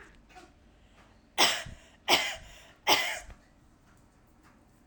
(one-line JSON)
{"three_cough_length": "4.9 s", "three_cough_amplitude": 13173, "three_cough_signal_mean_std_ratio": 0.34, "survey_phase": "alpha (2021-03-01 to 2021-08-12)", "age": "18-44", "gender": "Female", "wearing_mask": "No", "symptom_none": true, "smoker_status": "Never smoked", "respiratory_condition_asthma": false, "respiratory_condition_other": false, "recruitment_source": "REACT", "submission_delay": "5 days", "covid_test_result": "Negative", "covid_test_method": "RT-qPCR"}